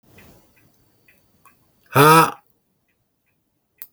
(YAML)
exhalation_length: 3.9 s
exhalation_amplitude: 32766
exhalation_signal_mean_std_ratio: 0.24
survey_phase: beta (2021-08-13 to 2022-03-07)
age: 45-64
gender: Male
wearing_mask: 'No'
symptom_none: true
smoker_status: Ex-smoker
respiratory_condition_asthma: false
respiratory_condition_other: false
recruitment_source: REACT
submission_delay: 2 days
covid_test_result: Negative
covid_test_method: RT-qPCR
influenza_a_test_result: Negative
influenza_b_test_result: Negative